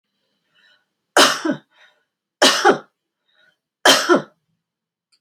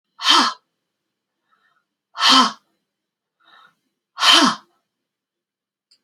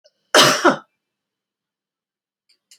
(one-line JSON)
{"three_cough_length": "5.2 s", "three_cough_amplitude": 32768, "three_cough_signal_mean_std_ratio": 0.33, "exhalation_length": "6.0 s", "exhalation_amplitude": 32707, "exhalation_signal_mean_std_ratio": 0.31, "cough_length": "2.8 s", "cough_amplitude": 32767, "cough_signal_mean_std_ratio": 0.28, "survey_phase": "alpha (2021-03-01 to 2021-08-12)", "age": "65+", "gender": "Female", "wearing_mask": "No", "symptom_none": true, "smoker_status": "Never smoked", "respiratory_condition_asthma": false, "respiratory_condition_other": false, "recruitment_source": "REACT", "submission_delay": "1 day", "covid_test_result": "Negative", "covid_test_method": "RT-qPCR"}